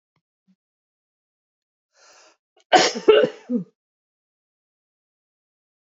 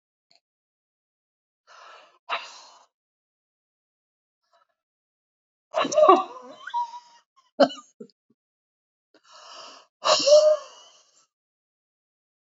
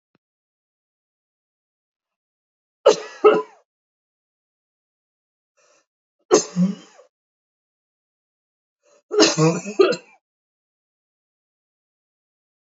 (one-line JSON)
{"cough_length": "5.9 s", "cough_amplitude": 27643, "cough_signal_mean_std_ratio": 0.23, "exhalation_length": "12.5 s", "exhalation_amplitude": 27106, "exhalation_signal_mean_std_ratio": 0.25, "three_cough_length": "12.8 s", "three_cough_amplitude": 32768, "three_cough_signal_mean_std_ratio": 0.23, "survey_phase": "beta (2021-08-13 to 2022-03-07)", "age": "45-64", "gender": "Female", "wearing_mask": "No", "symptom_headache": true, "smoker_status": "Prefer not to say", "respiratory_condition_asthma": false, "respiratory_condition_other": false, "recruitment_source": "REACT", "submission_delay": "3 days", "covid_test_result": "Negative", "covid_test_method": "RT-qPCR", "influenza_a_test_result": "Negative", "influenza_b_test_result": "Negative"}